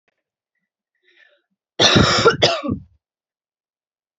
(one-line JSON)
{"cough_length": "4.2 s", "cough_amplitude": 31770, "cough_signal_mean_std_ratio": 0.35, "survey_phase": "beta (2021-08-13 to 2022-03-07)", "age": "18-44", "gender": "Female", "wearing_mask": "No", "symptom_none": true, "smoker_status": "Never smoked", "respiratory_condition_asthma": true, "respiratory_condition_other": false, "recruitment_source": "REACT", "submission_delay": "1 day", "covid_test_result": "Negative", "covid_test_method": "RT-qPCR"}